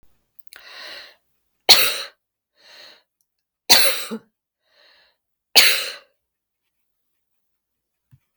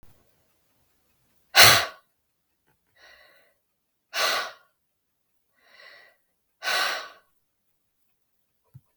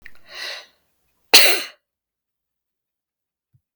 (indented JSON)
{
  "three_cough_length": "8.4 s",
  "three_cough_amplitude": 32768,
  "three_cough_signal_mean_std_ratio": 0.25,
  "exhalation_length": "9.0 s",
  "exhalation_amplitude": 32768,
  "exhalation_signal_mean_std_ratio": 0.22,
  "cough_length": "3.8 s",
  "cough_amplitude": 32768,
  "cough_signal_mean_std_ratio": 0.23,
  "survey_phase": "beta (2021-08-13 to 2022-03-07)",
  "age": "65+",
  "gender": "Female",
  "wearing_mask": "No",
  "symptom_none": true,
  "smoker_status": "Never smoked",
  "respiratory_condition_asthma": false,
  "respiratory_condition_other": false,
  "recruitment_source": "REACT",
  "submission_delay": "1 day",
  "covid_test_result": "Negative",
  "covid_test_method": "RT-qPCR",
  "influenza_a_test_result": "Negative",
  "influenza_b_test_result": "Negative"
}